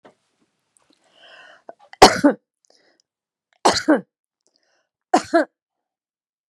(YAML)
three_cough_length: 6.5 s
three_cough_amplitude: 32768
three_cough_signal_mean_std_ratio: 0.23
survey_phase: beta (2021-08-13 to 2022-03-07)
age: 45-64
gender: Female
wearing_mask: 'No'
symptom_none: true
smoker_status: Never smoked
respiratory_condition_asthma: false
respiratory_condition_other: false
recruitment_source: REACT
submission_delay: 1 day
covid_test_result: Negative
covid_test_method: RT-qPCR